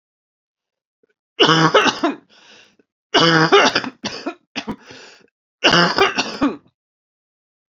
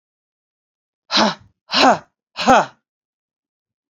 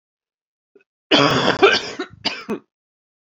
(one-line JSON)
{"three_cough_length": "7.7 s", "three_cough_amplitude": 31887, "three_cough_signal_mean_std_ratio": 0.42, "exhalation_length": "3.9 s", "exhalation_amplitude": 29681, "exhalation_signal_mean_std_ratio": 0.32, "cough_length": "3.3 s", "cough_amplitude": 29221, "cough_signal_mean_std_ratio": 0.4, "survey_phase": "beta (2021-08-13 to 2022-03-07)", "age": "45-64", "gender": "Female", "wearing_mask": "No", "symptom_cough_any": true, "symptom_runny_or_blocked_nose": true, "symptom_shortness_of_breath": true, "symptom_fatigue": true, "symptom_change_to_sense_of_smell_or_taste": true, "symptom_other": true, "symptom_onset": "6 days", "smoker_status": "Ex-smoker", "respiratory_condition_asthma": false, "respiratory_condition_other": false, "recruitment_source": "Test and Trace", "submission_delay": "2 days", "covid_test_method": "RT-qPCR", "covid_ct_value": 25.6, "covid_ct_gene": "ORF1ab gene"}